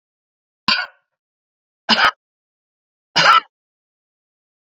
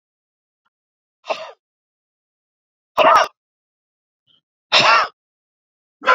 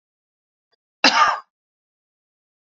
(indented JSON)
{
  "three_cough_length": "4.6 s",
  "three_cough_amplitude": 31543,
  "three_cough_signal_mean_std_ratio": 0.28,
  "exhalation_length": "6.1 s",
  "exhalation_amplitude": 30427,
  "exhalation_signal_mean_std_ratio": 0.29,
  "cough_length": "2.7 s",
  "cough_amplitude": 32369,
  "cough_signal_mean_std_ratio": 0.26,
  "survey_phase": "beta (2021-08-13 to 2022-03-07)",
  "age": "45-64",
  "gender": "Female",
  "wearing_mask": "No",
  "symptom_cough_any": true,
  "symptom_runny_or_blocked_nose": true,
  "symptom_shortness_of_breath": true,
  "symptom_sore_throat": true,
  "symptom_abdominal_pain": true,
  "symptom_fatigue": true,
  "symptom_fever_high_temperature": true,
  "symptom_headache": true,
  "symptom_change_to_sense_of_smell_or_taste": true,
  "symptom_loss_of_taste": true,
  "symptom_onset": "3 days",
  "smoker_status": "Ex-smoker",
  "respiratory_condition_asthma": true,
  "respiratory_condition_other": false,
  "recruitment_source": "Test and Trace",
  "submission_delay": "1 day",
  "covid_test_result": "Positive",
  "covid_test_method": "ePCR"
}